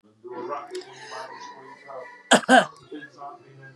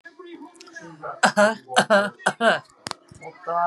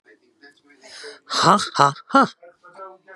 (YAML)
cough_length: 3.8 s
cough_amplitude: 27831
cough_signal_mean_std_ratio: 0.33
three_cough_length: 3.7 s
three_cough_amplitude: 30925
three_cough_signal_mean_std_ratio: 0.44
exhalation_length: 3.2 s
exhalation_amplitude: 32704
exhalation_signal_mean_std_ratio: 0.35
survey_phase: beta (2021-08-13 to 2022-03-07)
age: 45-64
gender: Female
wearing_mask: 'Yes'
symptom_none: true
smoker_status: Current smoker (1 to 10 cigarettes per day)
respiratory_condition_asthma: false
respiratory_condition_other: false
recruitment_source: REACT
submission_delay: 1 day
covid_test_result: Negative
covid_test_method: RT-qPCR